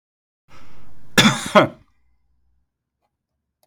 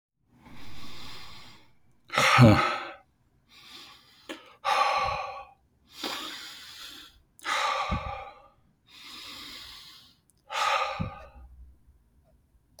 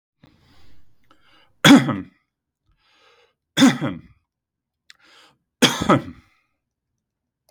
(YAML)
cough_length: 3.7 s
cough_amplitude: 32768
cough_signal_mean_std_ratio: 0.35
exhalation_length: 12.8 s
exhalation_amplitude: 22069
exhalation_signal_mean_std_ratio: 0.4
three_cough_length: 7.5 s
three_cough_amplitude: 32768
three_cough_signal_mean_std_ratio: 0.26
survey_phase: beta (2021-08-13 to 2022-03-07)
age: 18-44
gender: Male
wearing_mask: 'No'
symptom_none: true
smoker_status: Ex-smoker
respiratory_condition_asthma: false
respiratory_condition_other: false
recruitment_source: REACT
submission_delay: 3 days
covid_test_result: Negative
covid_test_method: RT-qPCR
influenza_a_test_result: Negative
influenza_b_test_result: Negative